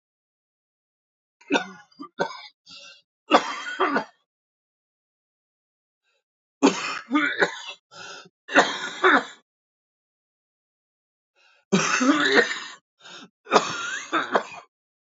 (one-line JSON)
{"three_cough_length": "15.2 s", "three_cough_amplitude": 26534, "three_cough_signal_mean_std_ratio": 0.37, "survey_phase": "alpha (2021-03-01 to 2021-08-12)", "age": "18-44", "gender": "Male", "wearing_mask": "No", "symptom_cough_any": true, "symptom_onset": "8 days", "smoker_status": "Never smoked", "respiratory_condition_asthma": false, "respiratory_condition_other": true, "recruitment_source": "REACT", "submission_delay": "1 day", "covid_test_result": "Negative", "covid_test_method": "RT-qPCR"}